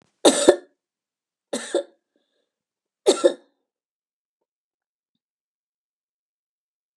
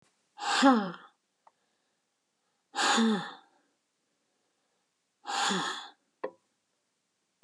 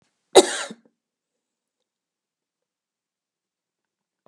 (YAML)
three_cough_length: 7.0 s
three_cough_amplitude: 32767
three_cough_signal_mean_std_ratio: 0.21
exhalation_length: 7.4 s
exhalation_amplitude: 13435
exhalation_signal_mean_std_ratio: 0.35
cough_length: 4.3 s
cough_amplitude: 32767
cough_signal_mean_std_ratio: 0.13
survey_phase: beta (2021-08-13 to 2022-03-07)
age: 65+
gender: Female
wearing_mask: 'No'
symptom_none: true
smoker_status: Never smoked
respiratory_condition_asthma: false
respiratory_condition_other: false
recruitment_source: REACT
submission_delay: 3 days
covid_test_result: Negative
covid_test_method: RT-qPCR
influenza_a_test_result: Negative
influenza_b_test_result: Negative